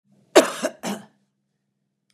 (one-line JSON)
{"cough_length": "2.1 s", "cough_amplitude": 32767, "cough_signal_mean_std_ratio": 0.25, "survey_phase": "beta (2021-08-13 to 2022-03-07)", "age": "65+", "gender": "Female", "wearing_mask": "No", "symptom_none": true, "smoker_status": "Never smoked", "respiratory_condition_asthma": false, "respiratory_condition_other": false, "recruitment_source": "REACT", "submission_delay": "2 days", "covid_test_result": "Negative", "covid_test_method": "RT-qPCR", "influenza_a_test_result": "Negative", "influenza_b_test_result": "Negative"}